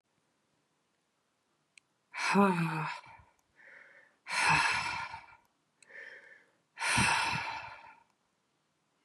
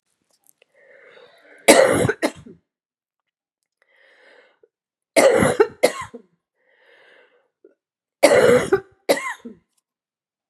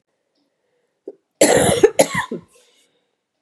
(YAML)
exhalation_length: 9.0 s
exhalation_amplitude: 8024
exhalation_signal_mean_std_ratio: 0.42
three_cough_length: 10.5 s
three_cough_amplitude: 32768
three_cough_signal_mean_std_ratio: 0.32
cough_length: 3.4 s
cough_amplitude: 32768
cough_signal_mean_std_ratio: 0.34
survey_phase: beta (2021-08-13 to 2022-03-07)
age: 65+
gender: Female
wearing_mask: 'No'
symptom_cough_any: true
symptom_runny_or_blocked_nose: true
symptom_diarrhoea: true
symptom_fatigue: true
symptom_headache: true
symptom_change_to_sense_of_smell_or_taste: true
symptom_onset: 5 days
smoker_status: Never smoked
respiratory_condition_asthma: false
respiratory_condition_other: false
recruitment_source: Test and Trace
submission_delay: 1 day
covid_test_result: Positive
covid_test_method: RT-qPCR
covid_ct_value: 19.2
covid_ct_gene: N gene